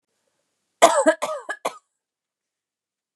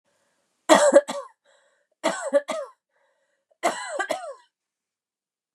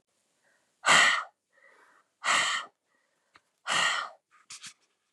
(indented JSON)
{
  "cough_length": "3.2 s",
  "cough_amplitude": 29204,
  "cough_signal_mean_std_ratio": 0.28,
  "three_cough_length": "5.5 s",
  "three_cough_amplitude": 28560,
  "three_cough_signal_mean_std_ratio": 0.32,
  "exhalation_length": "5.1 s",
  "exhalation_amplitude": 13627,
  "exhalation_signal_mean_std_ratio": 0.37,
  "survey_phase": "beta (2021-08-13 to 2022-03-07)",
  "age": "18-44",
  "gender": "Female",
  "wearing_mask": "No",
  "symptom_none": true,
  "smoker_status": "Never smoked",
  "respiratory_condition_asthma": true,
  "respiratory_condition_other": false,
  "recruitment_source": "REACT",
  "submission_delay": "1 day",
  "covid_test_result": "Negative",
  "covid_test_method": "RT-qPCR",
  "influenza_a_test_result": "Negative",
  "influenza_b_test_result": "Negative"
}